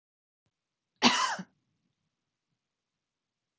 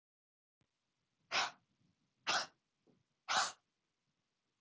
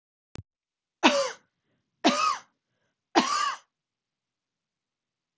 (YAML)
cough_length: 3.6 s
cough_amplitude: 13956
cough_signal_mean_std_ratio: 0.23
exhalation_length: 4.6 s
exhalation_amplitude: 2987
exhalation_signal_mean_std_ratio: 0.28
three_cough_length: 5.4 s
three_cough_amplitude: 23668
three_cough_signal_mean_std_ratio: 0.32
survey_phase: beta (2021-08-13 to 2022-03-07)
age: 18-44
gender: Female
wearing_mask: 'No'
symptom_none: true
smoker_status: Ex-smoker
respiratory_condition_asthma: false
respiratory_condition_other: false
recruitment_source: REACT
submission_delay: 12 days
covid_test_result: Negative
covid_test_method: RT-qPCR